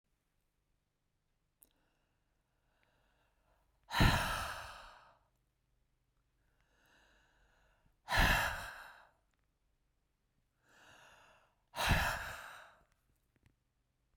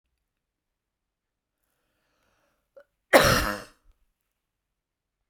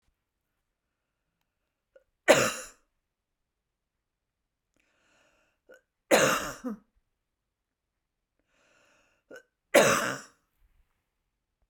{"exhalation_length": "14.2 s", "exhalation_amplitude": 5660, "exhalation_signal_mean_std_ratio": 0.28, "cough_length": "5.3 s", "cough_amplitude": 27824, "cough_signal_mean_std_ratio": 0.2, "three_cough_length": "11.7 s", "three_cough_amplitude": 17801, "three_cough_signal_mean_std_ratio": 0.23, "survey_phase": "beta (2021-08-13 to 2022-03-07)", "age": "45-64", "gender": "Female", "wearing_mask": "No", "symptom_none": true, "smoker_status": "Ex-smoker", "respiratory_condition_asthma": false, "respiratory_condition_other": false, "recruitment_source": "REACT", "submission_delay": "4 days", "covid_test_result": "Negative", "covid_test_method": "RT-qPCR"}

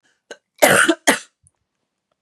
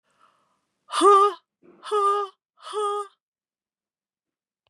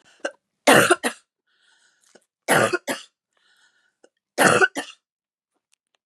{"cough_length": "2.2 s", "cough_amplitude": 32768, "cough_signal_mean_std_ratio": 0.34, "exhalation_length": "4.7 s", "exhalation_amplitude": 16631, "exhalation_signal_mean_std_ratio": 0.37, "three_cough_length": "6.1 s", "three_cough_amplitude": 30489, "three_cough_signal_mean_std_ratio": 0.31, "survey_phase": "beta (2021-08-13 to 2022-03-07)", "age": "45-64", "gender": "Female", "wearing_mask": "No", "symptom_cough_any": true, "symptom_runny_or_blocked_nose": true, "symptom_onset": "11 days", "smoker_status": "Never smoked", "respiratory_condition_asthma": false, "respiratory_condition_other": false, "recruitment_source": "REACT", "submission_delay": "2 days", "covid_test_result": "Negative", "covid_test_method": "RT-qPCR", "influenza_a_test_result": "Unknown/Void", "influenza_b_test_result": "Unknown/Void"}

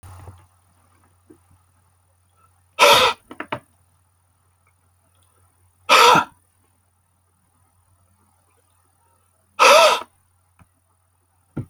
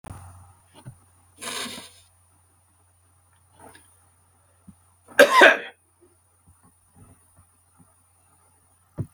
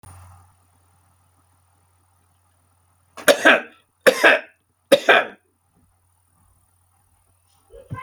{"exhalation_length": "11.7 s", "exhalation_amplitude": 32767, "exhalation_signal_mean_std_ratio": 0.26, "cough_length": "9.1 s", "cough_amplitude": 31296, "cough_signal_mean_std_ratio": 0.2, "three_cough_length": "8.0 s", "three_cough_amplitude": 31022, "three_cough_signal_mean_std_ratio": 0.25, "survey_phase": "beta (2021-08-13 to 2022-03-07)", "age": "45-64", "gender": "Male", "wearing_mask": "No", "symptom_none": true, "smoker_status": "Never smoked", "respiratory_condition_asthma": false, "respiratory_condition_other": false, "recruitment_source": "REACT", "submission_delay": "3 days", "covid_test_result": "Negative", "covid_test_method": "RT-qPCR"}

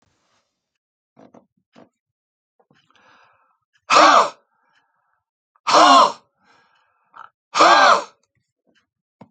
{"exhalation_length": "9.3 s", "exhalation_amplitude": 32339, "exhalation_signal_mean_std_ratio": 0.3, "survey_phase": "alpha (2021-03-01 to 2021-08-12)", "age": "65+", "gender": "Male", "wearing_mask": "No", "symptom_none": true, "smoker_status": "Never smoked", "respiratory_condition_asthma": false, "respiratory_condition_other": false, "recruitment_source": "REACT", "submission_delay": "1 day", "covid_test_result": "Negative", "covid_test_method": "RT-qPCR"}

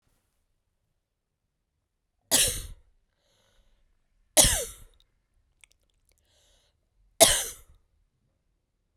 {"three_cough_length": "9.0 s", "three_cough_amplitude": 31582, "three_cough_signal_mean_std_ratio": 0.22, "survey_phase": "beta (2021-08-13 to 2022-03-07)", "age": "18-44", "gender": "Female", "wearing_mask": "No", "symptom_cough_any": true, "symptom_runny_or_blocked_nose": true, "symptom_sore_throat": true, "symptom_fatigue": true, "symptom_headache": true, "smoker_status": "Never smoked", "respiratory_condition_asthma": false, "respiratory_condition_other": false, "recruitment_source": "Test and Trace", "submission_delay": "1 day", "covid_test_result": "Positive", "covid_test_method": "RT-qPCR", "covid_ct_value": 26.0, "covid_ct_gene": "N gene"}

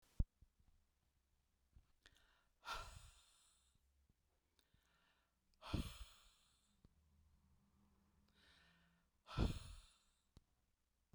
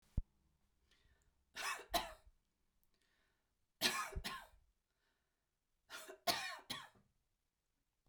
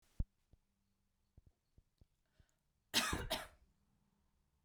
{"exhalation_length": "11.1 s", "exhalation_amplitude": 1971, "exhalation_signal_mean_std_ratio": 0.23, "three_cough_length": "8.1 s", "three_cough_amplitude": 3501, "three_cough_signal_mean_std_ratio": 0.32, "cough_length": "4.6 s", "cough_amplitude": 3405, "cough_signal_mean_std_ratio": 0.26, "survey_phase": "beta (2021-08-13 to 2022-03-07)", "age": "45-64", "gender": "Female", "wearing_mask": "No", "symptom_headache": true, "smoker_status": "Never smoked", "respiratory_condition_asthma": true, "respiratory_condition_other": false, "recruitment_source": "REACT", "submission_delay": "1 day", "covid_test_result": "Negative", "covid_test_method": "RT-qPCR"}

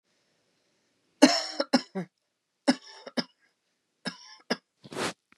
{"three_cough_length": "5.4 s", "three_cough_amplitude": 26591, "three_cough_signal_mean_std_ratio": 0.26, "survey_phase": "beta (2021-08-13 to 2022-03-07)", "age": "45-64", "gender": "Female", "wearing_mask": "No", "symptom_none": true, "smoker_status": "Never smoked", "respiratory_condition_asthma": false, "respiratory_condition_other": false, "recruitment_source": "REACT", "submission_delay": "1 day", "covid_test_result": "Negative", "covid_test_method": "RT-qPCR", "influenza_a_test_result": "Negative", "influenza_b_test_result": "Negative"}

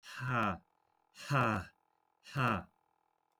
{"exhalation_length": "3.4 s", "exhalation_amplitude": 3562, "exhalation_signal_mean_std_ratio": 0.47, "survey_phase": "beta (2021-08-13 to 2022-03-07)", "age": "18-44", "gender": "Male", "wearing_mask": "No", "symptom_cough_any": true, "symptom_sore_throat": true, "symptom_onset": "5 days", "smoker_status": "Ex-smoker", "respiratory_condition_asthma": false, "respiratory_condition_other": false, "recruitment_source": "REACT", "submission_delay": "2 days", "covid_test_result": "Negative", "covid_test_method": "RT-qPCR"}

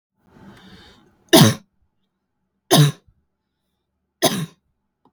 {"three_cough_length": "5.1 s", "three_cough_amplitude": 32768, "three_cough_signal_mean_std_ratio": 0.27, "survey_phase": "beta (2021-08-13 to 2022-03-07)", "age": "18-44", "gender": "Female", "wearing_mask": "No", "symptom_none": true, "smoker_status": "Never smoked", "respiratory_condition_asthma": true, "respiratory_condition_other": false, "recruitment_source": "REACT", "submission_delay": "1 day", "covid_test_result": "Negative", "covid_test_method": "RT-qPCR", "influenza_a_test_result": "Unknown/Void", "influenza_b_test_result": "Unknown/Void"}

